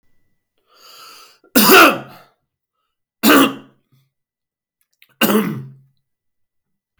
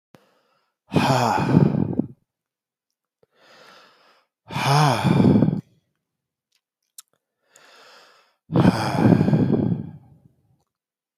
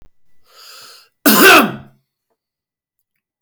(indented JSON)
{
  "three_cough_length": "7.0 s",
  "three_cough_amplitude": 32768,
  "three_cough_signal_mean_std_ratio": 0.31,
  "exhalation_length": "11.2 s",
  "exhalation_amplitude": 25817,
  "exhalation_signal_mean_std_ratio": 0.44,
  "cough_length": "3.4 s",
  "cough_amplitude": 32768,
  "cough_signal_mean_std_ratio": 0.32,
  "survey_phase": "beta (2021-08-13 to 2022-03-07)",
  "age": "45-64",
  "gender": "Male",
  "wearing_mask": "No",
  "symptom_none": true,
  "smoker_status": "Never smoked",
  "respiratory_condition_asthma": true,
  "respiratory_condition_other": false,
  "recruitment_source": "REACT",
  "submission_delay": "2 days",
  "covid_test_result": "Negative",
  "covid_test_method": "RT-qPCR"
}